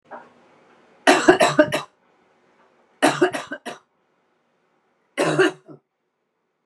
{"three_cough_length": "6.7 s", "three_cough_amplitude": 32767, "three_cough_signal_mean_std_ratio": 0.33, "survey_phase": "beta (2021-08-13 to 2022-03-07)", "age": "18-44", "gender": "Female", "wearing_mask": "No", "symptom_none": true, "smoker_status": "Current smoker (1 to 10 cigarettes per day)", "respiratory_condition_asthma": false, "respiratory_condition_other": false, "recruitment_source": "REACT", "submission_delay": "1 day", "covid_test_result": "Negative", "covid_test_method": "RT-qPCR"}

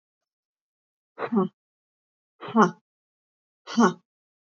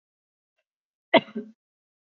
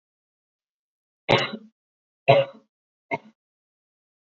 {"exhalation_length": "4.4 s", "exhalation_amplitude": 17432, "exhalation_signal_mean_std_ratio": 0.27, "cough_length": "2.1 s", "cough_amplitude": 21830, "cough_signal_mean_std_ratio": 0.16, "three_cough_length": "4.3 s", "three_cough_amplitude": 26581, "three_cough_signal_mean_std_ratio": 0.23, "survey_phase": "alpha (2021-03-01 to 2021-08-12)", "age": "18-44", "gender": "Female", "wearing_mask": "No", "symptom_diarrhoea": true, "symptom_headache": true, "symptom_onset": "13 days", "smoker_status": "Never smoked", "respiratory_condition_asthma": false, "respiratory_condition_other": false, "recruitment_source": "REACT", "submission_delay": "2 days", "covid_test_result": "Negative", "covid_test_method": "RT-qPCR"}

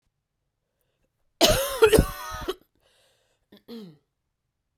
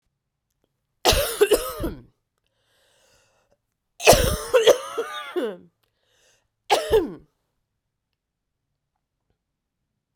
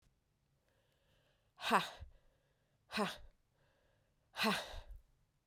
{"cough_length": "4.8 s", "cough_amplitude": 23839, "cough_signal_mean_std_ratio": 0.3, "three_cough_length": "10.2 s", "three_cough_amplitude": 32768, "three_cough_signal_mean_std_ratio": 0.32, "exhalation_length": "5.5 s", "exhalation_amplitude": 4746, "exhalation_signal_mean_std_ratio": 0.31, "survey_phase": "beta (2021-08-13 to 2022-03-07)", "age": "45-64", "gender": "Female", "wearing_mask": "No", "symptom_cough_any": true, "symptom_shortness_of_breath": true, "symptom_sore_throat": true, "symptom_fatigue": true, "symptom_headache": true, "symptom_change_to_sense_of_smell_or_taste": true, "symptom_loss_of_taste": true, "symptom_onset": "10 days", "smoker_status": "Never smoked", "respiratory_condition_asthma": false, "respiratory_condition_other": false, "recruitment_source": "Test and Trace", "submission_delay": "1 day", "covid_test_result": "Positive", "covid_test_method": "RT-qPCR", "covid_ct_value": 23.9, "covid_ct_gene": "ORF1ab gene", "covid_ct_mean": 24.3, "covid_viral_load": "11000 copies/ml", "covid_viral_load_category": "Low viral load (10K-1M copies/ml)"}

